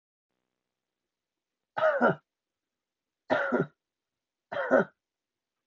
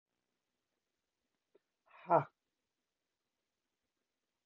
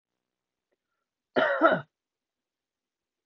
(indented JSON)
{
  "three_cough_length": "5.7 s",
  "three_cough_amplitude": 10582,
  "three_cough_signal_mean_std_ratio": 0.32,
  "exhalation_length": "4.5 s",
  "exhalation_amplitude": 5368,
  "exhalation_signal_mean_std_ratio": 0.13,
  "cough_length": "3.3 s",
  "cough_amplitude": 16536,
  "cough_signal_mean_std_ratio": 0.27,
  "survey_phase": "beta (2021-08-13 to 2022-03-07)",
  "age": "45-64",
  "gender": "Female",
  "wearing_mask": "No",
  "symptom_fatigue": true,
  "symptom_onset": "4 days",
  "smoker_status": "Ex-smoker",
  "respiratory_condition_asthma": false,
  "respiratory_condition_other": false,
  "recruitment_source": "REACT",
  "submission_delay": "1 day",
  "covid_test_result": "Negative",
  "covid_test_method": "RT-qPCR",
  "influenza_a_test_result": "Negative",
  "influenza_b_test_result": "Negative"
}